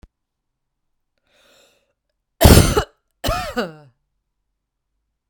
{"cough_length": "5.3 s", "cough_amplitude": 32768, "cough_signal_mean_std_ratio": 0.25, "survey_phase": "beta (2021-08-13 to 2022-03-07)", "age": "45-64", "gender": "Female", "wearing_mask": "No", "symptom_runny_or_blocked_nose": true, "symptom_sore_throat": true, "symptom_abdominal_pain": true, "symptom_diarrhoea": true, "symptom_fatigue": true, "symptom_fever_high_temperature": true, "symptom_headache": true, "smoker_status": "Ex-smoker", "respiratory_condition_asthma": false, "respiratory_condition_other": false, "recruitment_source": "Test and Trace", "submission_delay": "2 days", "covid_test_result": "Positive", "covid_test_method": "RT-qPCR", "covid_ct_value": 30.2, "covid_ct_gene": "ORF1ab gene"}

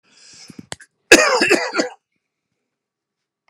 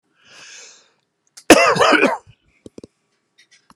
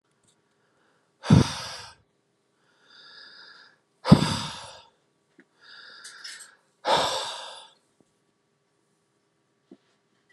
{"three_cough_length": "3.5 s", "three_cough_amplitude": 32768, "three_cough_signal_mean_std_ratio": 0.31, "cough_length": "3.8 s", "cough_amplitude": 32768, "cough_signal_mean_std_ratio": 0.32, "exhalation_length": "10.3 s", "exhalation_amplitude": 29942, "exhalation_signal_mean_std_ratio": 0.24, "survey_phase": "alpha (2021-03-01 to 2021-08-12)", "age": "65+", "gender": "Male", "wearing_mask": "No", "symptom_none": true, "smoker_status": "Ex-smoker", "respiratory_condition_asthma": false, "respiratory_condition_other": false, "recruitment_source": "REACT", "submission_delay": "11 days", "covid_test_result": "Negative", "covid_test_method": "RT-qPCR"}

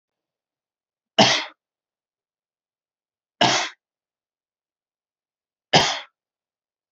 {"three_cough_length": "6.9 s", "three_cough_amplitude": 28503, "three_cough_signal_mean_std_ratio": 0.24, "survey_phase": "beta (2021-08-13 to 2022-03-07)", "age": "18-44", "gender": "Male", "wearing_mask": "No", "symptom_cough_any": true, "symptom_sore_throat": true, "symptom_onset": "5 days", "smoker_status": "Never smoked", "respiratory_condition_asthma": false, "respiratory_condition_other": false, "recruitment_source": "REACT", "submission_delay": "1 day", "covid_test_result": "Negative", "covid_test_method": "RT-qPCR"}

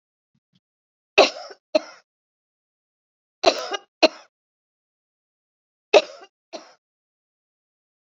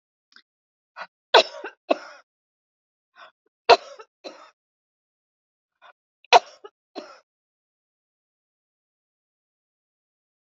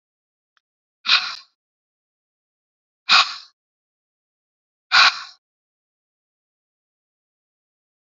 {"three_cough_length": "8.2 s", "three_cough_amplitude": 28117, "three_cough_signal_mean_std_ratio": 0.18, "cough_length": "10.4 s", "cough_amplitude": 32767, "cough_signal_mean_std_ratio": 0.14, "exhalation_length": "8.2 s", "exhalation_amplitude": 29015, "exhalation_signal_mean_std_ratio": 0.21, "survey_phase": "beta (2021-08-13 to 2022-03-07)", "age": "65+", "gender": "Female", "wearing_mask": "No", "symptom_cough_any": true, "symptom_abdominal_pain": true, "symptom_onset": "12 days", "smoker_status": "Ex-smoker", "respiratory_condition_asthma": false, "respiratory_condition_other": false, "recruitment_source": "REACT", "submission_delay": "1 day", "covid_test_result": "Negative", "covid_test_method": "RT-qPCR"}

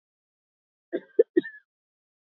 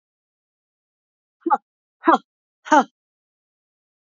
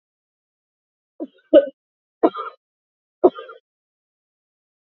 {"cough_length": "2.4 s", "cough_amplitude": 13699, "cough_signal_mean_std_ratio": 0.17, "exhalation_length": "4.2 s", "exhalation_amplitude": 28118, "exhalation_signal_mean_std_ratio": 0.21, "three_cough_length": "4.9 s", "three_cough_amplitude": 27447, "three_cough_signal_mean_std_ratio": 0.19, "survey_phase": "beta (2021-08-13 to 2022-03-07)", "age": "45-64", "gender": "Female", "wearing_mask": "No", "symptom_none": true, "smoker_status": "Ex-smoker", "respiratory_condition_asthma": false, "respiratory_condition_other": false, "recruitment_source": "REACT", "submission_delay": "1 day", "covid_test_result": "Negative", "covid_test_method": "RT-qPCR", "influenza_a_test_result": "Negative", "influenza_b_test_result": "Negative"}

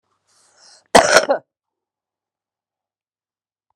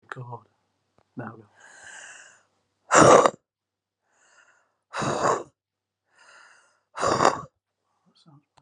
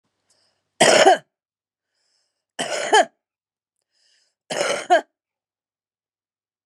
{"cough_length": "3.8 s", "cough_amplitude": 32768, "cough_signal_mean_std_ratio": 0.22, "exhalation_length": "8.6 s", "exhalation_amplitude": 32048, "exhalation_signal_mean_std_ratio": 0.28, "three_cough_length": "6.7 s", "three_cough_amplitude": 31638, "three_cough_signal_mean_std_ratio": 0.3, "survey_phase": "beta (2021-08-13 to 2022-03-07)", "age": "65+", "gender": "Female", "wearing_mask": "No", "symptom_cough_any": true, "symptom_shortness_of_breath": true, "smoker_status": "Current smoker (11 or more cigarettes per day)", "respiratory_condition_asthma": true, "respiratory_condition_other": false, "recruitment_source": "REACT", "submission_delay": "10 days", "covid_test_result": "Negative", "covid_test_method": "RT-qPCR"}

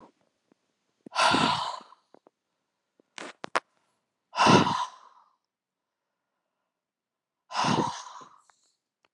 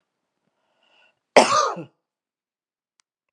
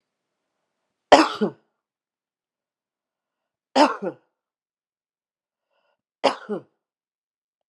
{"exhalation_length": "9.1 s", "exhalation_amplitude": 20168, "exhalation_signal_mean_std_ratio": 0.31, "cough_length": "3.3 s", "cough_amplitude": 32767, "cough_signal_mean_std_ratio": 0.23, "three_cough_length": "7.7 s", "three_cough_amplitude": 32768, "three_cough_signal_mean_std_ratio": 0.19, "survey_phase": "beta (2021-08-13 to 2022-03-07)", "age": "45-64", "gender": "Female", "wearing_mask": "No", "symptom_none": true, "smoker_status": "Never smoked", "respiratory_condition_asthma": false, "respiratory_condition_other": false, "recruitment_source": "REACT", "submission_delay": "1 day", "covid_test_result": "Negative", "covid_test_method": "RT-qPCR", "influenza_a_test_result": "Unknown/Void", "influenza_b_test_result": "Unknown/Void"}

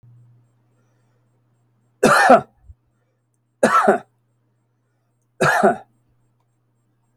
{"three_cough_length": "7.2 s", "three_cough_amplitude": 32768, "three_cough_signal_mean_std_ratio": 0.31, "survey_phase": "alpha (2021-03-01 to 2021-08-12)", "age": "65+", "gender": "Male", "wearing_mask": "No", "symptom_none": true, "smoker_status": "Ex-smoker", "respiratory_condition_asthma": false, "respiratory_condition_other": false, "recruitment_source": "REACT", "submission_delay": "1 day", "covid_test_result": "Negative", "covid_test_method": "RT-qPCR"}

